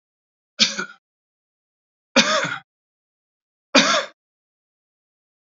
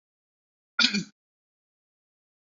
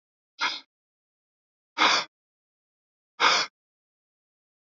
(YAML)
three_cough_length: 5.5 s
three_cough_amplitude: 32454
three_cough_signal_mean_std_ratio: 0.29
cough_length: 2.5 s
cough_amplitude: 18862
cough_signal_mean_std_ratio: 0.22
exhalation_length: 4.7 s
exhalation_amplitude: 15112
exhalation_signal_mean_std_ratio: 0.28
survey_phase: beta (2021-08-13 to 2022-03-07)
age: 45-64
gender: Male
wearing_mask: 'No'
symptom_none: true
smoker_status: Never smoked
respiratory_condition_asthma: false
respiratory_condition_other: false
recruitment_source: REACT
submission_delay: 0 days
covid_test_result: Negative
covid_test_method: RT-qPCR